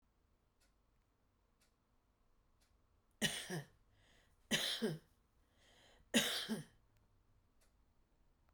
{"three_cough_length": "8.5 s", "three_cough_amplitude": 3738, "three_cough_signal_mean_std_ratio": 0.31, "survey_phase": "beta (2021-08-13 to 2022-03-07)", "age": "45-64", "gender": "Female", "wearing_mask": "No", "symptom_shortness_of_breath": true, "symptom_fatigue": true, "symptom_headache": true, "smoker_status": "Current smoker (e-cigarettes or vapes only)", "respiratory_condition_asthma": false, "respiratory_condition_other": false, "recruitment_source": "REACT", "submission_delay": "15 days", "covid_test_result": "Negative", "covid_test_method": "RT-qPCR"}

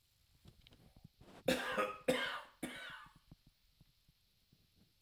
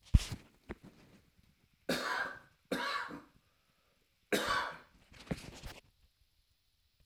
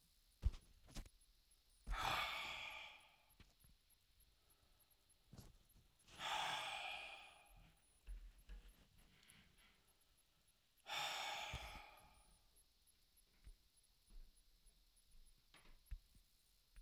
{"cough_length": "5.0 s", "cough_amplitude": 3472, "cough_signal_mean_std_ratio": 0.37, "three_cough_length": "7.1 s", "three_cough_amplitude": 10305, "three_cough_signal_mean_std_ratio": 0.33, "exhalation_length": "16.8 s", "exhalation_amplitude": 1406, "exhalation_signal_mean_std_ratio": 0.43, "survey_phase": "alpha (2021-03-01 to 2021-08-12)", "age": "65+", "gender": "Male", "wearing_mask": "No", "symptom_none": true, "smoker_status": "Ex-smoker", "respiratory_condition_asthma": true, "respiratory_condition_other": true, "recruitment_source": "REACT", "submission_delay": "3 days", "covid_test_result": "Negative", "covid_test_method": "RT-qPCR"}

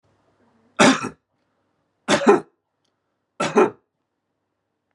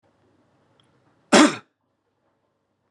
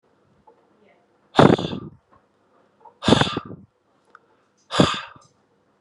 {"three_cough_length": "4.9 s", "three_cough_amplitude": 30268, "three_cough_signal_mean_std_ratio": 0.3, "cough_length": "2.9 s", "cough_amplitude": 29386, "cough_signal_mean_std_ratio": 0.21, "exhalation_length": "5.8 s", "exhalation_amplitude": 32768, "exhalation_signal_mean_std_ratio": 0.27, "survey_phase": "beta (2021-08-13 to 2022-03-07)", "age": "18-44", "gender": "Male", "wearing_mask": "No", "symptom_none": true, "smoker_status": "Never smoked", "respiratory_condition_asthma": false, "respiratory_condition_other": false, "recruitment_source": "REACT", "submission_delay": "2 days", "covid_test_result": "Negative", "covid_test_method": "RT-qPCR", "influenza_a_test_result": "Unknown/Void", "influenza_b_test_result": "Unknown/Void"}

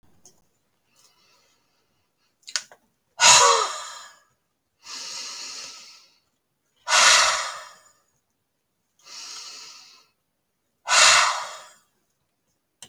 {"exhalation_length": "12.9 s", "exhalation_amplitude": 30369, "exhalation_signal_mean_std_ratio": 0.31, "survey_phase": "alpha (2021-03-01 to 2021-08-12)", "age": "65+", "gender": "Female", "wearing_mask": "No", "symptom_none": true, "smoker_status": "Ex-smoker", "respiratory_condition_asthma": false, "respiratory_condition_other": false, "recruitment_source": "REACT", "submission_delay": "2 days", "covid_test_result": "Negative", "covid_test_method": "RT-qPCR"}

